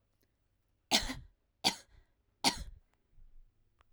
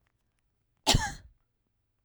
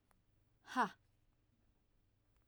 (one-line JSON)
{"three_cough_length": "3.9 s", "three_cough_amplitude": 9418, "three_cough_signal_mean_std_ratio": 0.27, "cough_length": "2.0 s", "cough_amplitude": 12376, "cough_signal_mean_std_ratio": 0.25, "exhalation_length": "2.5 s", "exhalation_amplitude": 2185, "exhalation_signal_mean_std_ratio": 0.22, "survey_phase": "alpha (2021-03-01 to 2021-08-12)", "age": "45-64", "gender": "Female", "wearing_mask": "No", "symptom_fatigue": true, "smoker_status": "Ex-smoker", "respiratory_condition_asthma": false, "respiratory_condition_other": false, "recruitment_source": "REACT", "submission_delay": "2 days", "covid_test_result": "Negative", "covid_test_method": "RT-qPCR"}